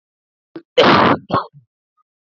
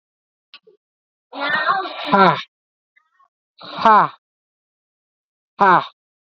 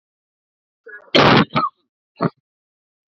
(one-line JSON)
{"cough_length": "2.3 s", "cough_amplitude": 30907, "cough_signal_mean_std_ratio": 0.39, "exhalation_length": "6.4 s", "exhalation_amplitude": 28882, "exhalation_signal_mean_std_ratio": 0.35, "three_cough_length": "3.1 s", "three_cough_amplitude": 29050, "three_cough_signal_mean_std_ratio": 0.32, "survey_phase": "beta (2021-08-13 to 2022-03-07)", "age": "18-44", "gender": "Male", "wearing_mask": "No", "symptom_cough_any": true, "symptom_runny_or_blocked_nose": true, "symptom_shortness_of_breath": true, "symptom_sore_throat": true, "symptom_diarrhoea": true, "symptom_fatigue": true, "symptom_fever_high_temperature": true, "symptom_headache": true, "symptom_change_to_sense_of_smell_or_taste": true, "symptom_loss_of_taste": true, "symptom_onset": "4 days", "smoker_status": "Current smoker (1 to 10 cigarettes per day)", "respiratory_condition_asthma": false, "respiratory_condition_other": false, "recruitment_source": "Test and Trace", "submission_delay": "2 days", "covid_test_result": "Positive", "covid_test_method": "RT-qPCR", "covid_ct_value": 18.3, "covid_ct_gene": "ORF1ab gene", "covid_ct_mean": 18.4, "covid_viral_load": "960000 copies/ml", "covid_viral_load_category": "Low viral load (10K-1M copies/ml)"}